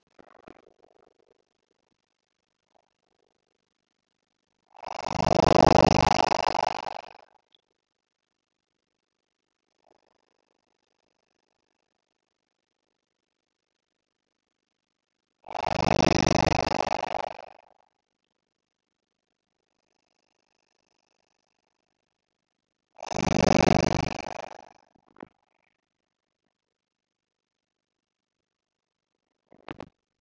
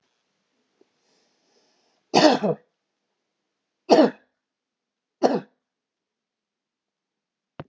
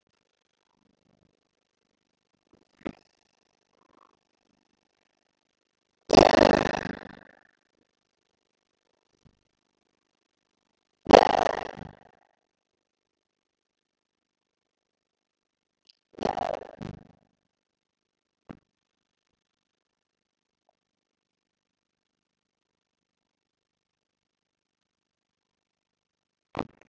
exhalation_length: 30.2 s
exhalation_amplitude: 21485
exhalation_signal_mean_std_ratio: 0.19
three_cough_length: 7.7 s
three_cough_amplitude: 26627
three_cough_signal_mean_std_ratio: 0.23
cough_length: 26.9 s
cough_amplitude: 30604
cough_signal_mean_std_ratio: 0.11
survey_phase: beta (2021-08-13 to 2022-03-07)
age: 65+
gender: Male
wearing_mask: 'No'
symptom_none: true
smoker_status: Never smoked
respiratory_condition_asthma: false
respiratory_condition_other: false
recruitment_source: REACT
submission_delay: 2 days
covid_test_result: Negative
covid_test_method: RT-qPCR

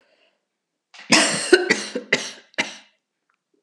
cough_length: 3.6 s
cough_amplitude: 32767
cough_signal_mean_std_ratio: 0.36
survey_phase: alpha (2021-03-01 to 2021-08-12)
age: 65+
gender: Female
wearing_mask: 'No'
symptom_cough_any: true
symptom_headache: true
symptom_onset: 3 days
smoker_status: Never smoked
respiratory_condition_asthma: false
respiratory_condition_other: false
recruitment_source: Test and Trace
submission_delay: 1 day
covid_test_result: Positive
covid_test_method: RT-qPCR
covid_ct_value: 21.1
covid_ct_gene: ORF1ab gene
covid_ct_mean: 22.1
covid_viral_load: 54000 copies/ml
covid_viral_load_category: Low viral load (10K-1M copies/ml)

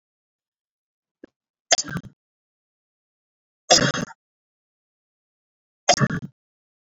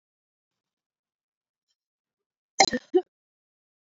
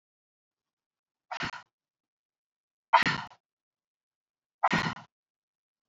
three_cough_length: 6.8 s
three_cough_amplitude: 32767
three_cough_signal_mean_std_ratio: 0.23
cough_length: 3.9 s
cough_amplitude: 32074
cough_signal_mean_std_ratio: 0.16
exhalation_length: 5.9 s
exhalation_amplitude: 14160
exhalation_signal_mean_std_ratio: 0.23
survey_phase: beta (2021-08-13 to 2022-03-07)
age: 18-44
gender: Female
wearing_mask: 'No'
symptom_none: true
smoker_status: Never smoked
respiratory_condition_asthma: false
respiratory_condition_other: false
recruitment_source: REACT
submission_delay: 1 day
covid_test_result: Negative
covid_test_method: RT-qPCR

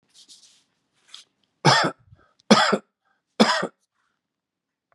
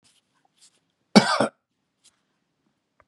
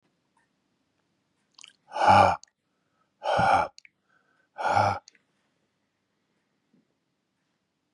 three_cough_length: 4.9 s
three_cough_amplitude: 32416
three_cough_signal_mean_std_ratio: 0.3
cough_length: 3.1 s
cough_amplitude: 32767
cough_signal_mean_std_ratio: 0.2
exhalation_length: 7.9 s
exhalation_amplitude: 17496
exhalation_signal_mean_std_ratio: 0.3
survey_phase: beta (2021-08-13 to 2022-03-07)
age: 45-64
gender: Male
wearing_mask: 'No'
symptom_none: true
symptom_onset: 13 days
smoker_status: Ex-smoker
respiratory_condition_asthma: false
respiratory_condition_other: false
recruitment_source: REACT
submission_delay: 1 day
covid_test_result: Negative
covid_test_method: RT-qPCR
influenza_a_test_result: Negative
influenza_b_test_result: Negative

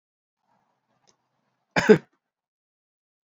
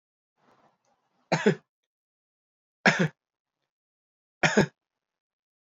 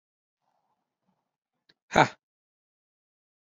cough_length: 3.2 s
cough_amplitude: 26151
cough_signal_mean_std_ratio: 0.16
three_cough_length: 5.7 s
three_cough_amplitude: 19910
three_cough_signal_mean_std_ratio: 0.24
exhalation_length: 3.4 s
exhalation_amplitude: 18904
exhalation_signal_mean_std_ratio: 0.13
survey_phase: beta (2021-08-13 to 2022-03-07)
age: 45-64
gender: Male
wearing_mask: 'No'
symptom_cough_any: true
symptom_sore_throat: true
smoker_status: Ex-smoker
respiratory_condition_asthma: false
respiratory_condition_other: false
recruitment_source: Test and Trace
submission_delay: 2 days
covid_test_result: Positive
covid_test_method: RT-qPCR
covid_ct_value: 17.2
covid_ct_gene: ORF1ab gene
covid_ct_mean: 17.6
covid_viral_load: 1700000 copies/ml
covid_viral_load_category: High viral load (>1M copies/ml)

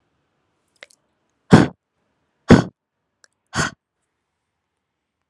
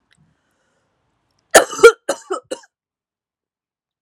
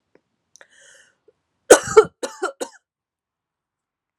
exhalation_length: 5.3 s
exhalation_amplitude: 32768
exhalation_signal_mean_std_ratio: 0.19
cough_length: 4.0 s
cough_amplitude: 32768
cough_signal_mean_std_ratio: 0.2
three_cough_length: 4.2 s
three_cough_amplitude: 32768
three_cough_signal_mean_std_ratio: 0.18
survey_phase: alpha (2021-03-01 to 2021-08-12)
age: 18-44
gender: Female
wearing_mask: 'No'
symptom_cough_any: true
symptom_fatigue: true
symptom_change_to_sense_of_smell_or_taste: true
symptom_onset: 5 days
smoker_status: Never smoked
respiratory_condition_asthma: false
respiratory_condition_other: false
recruitment_source: Test and Trace
submission_delay: 2 days
covid_test_result: Positive
covid_test_method: RT-qPCR
covid_ct_value: 17.4
covid_ct_gene: N gene
covid_ct_mean: 17.5
covid_viral_load: 1900000 copies/ml
covid_viral_load_category: High viral load (>1M copies/ml)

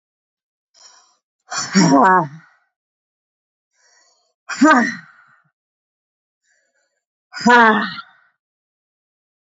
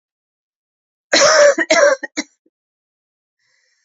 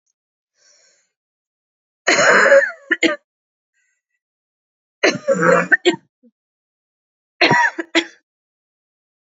exhalation_length: 9.6 s
exhalation_amplitude: 29007
exhalation_signal_mean_std_ratio: 0.31
cough_length: 3.8 s
cough_amplitude: 30836
cough_signal_mean_std_ratio: 0.38
three_cough_length: 9.4 s
three_cough_amplitude: 29117
three_cough_signal_mean_std_ratio: 0.36
survey_phase: beta (2021-08-13 to 2022-03-07)
age: 45-64
gender: Female
wearing_mask: 'No'
symptom_cough_any: true
symptom_runny_or_blocked_nose: true
symptom_sore_throat: true
symptom_fatigue: true
symptom_headache: true
symptom_other: true
smoker_status: Ex-smoker
respiratory_condition_asthma: false
respiratory_condition_other: false
recruitment_source: Test and Trace
submission_delay: 2 days
covid_test_result: Positive
covid_test_method: RT-qPCR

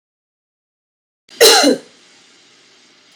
cough_length: 3.2 s
cough_amplitude: 32768
cough_signal_mean_std_ratio: 0.29
survey_phase: beta (2021-08-13 to 2022-03-07)
age: 18-44
gender: Female
wearing_mask: 'No'
symptom_new_continuous_cough: true
symptom_runny_or_blocked_nose: true
symptom_sore_throat: true
symptom_fever_high_temperature: true
symptom_headache: true
symptom_other: true
symptom_onset: 3 days
smoker_status: Never smoked
respiratory_condition_asthma: false
respiratory_condition_other: false
recruitment_source: Test and Trace
submission_delay: 1 day
covid_test_result: Positive
covid_test_method: RT-qPCR
covid_ct_value: 23.5
covid_ct_gene: ORF1ab gene
covid_ct_mean: 23.9
covid_viral_load: 14000 copies/ml
covid_viral_load_category: Low viral load (10K-1M copies/ml)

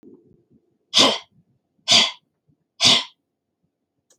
exhalation_length: 4.2 s
exhalation_amplitude: 32768
exhalation_signal_mean_std_ratio: 0.31
survey_phase: beta (2021-08-13 to 2022-03-07)
age: 45-64
gender: Female
wearing_mask: 'No'
symptom_none: true
smoker_status: Never smoked
respiratory_condition_asthma: false
respiratory_condition_other: false
recruitment_source: REACT
submission_delay: 3 days
covid_test_result: Negative
covid_test_method: RT-qPCR
influenza_a_test_result: Negative
influenza_b_test_result: Negative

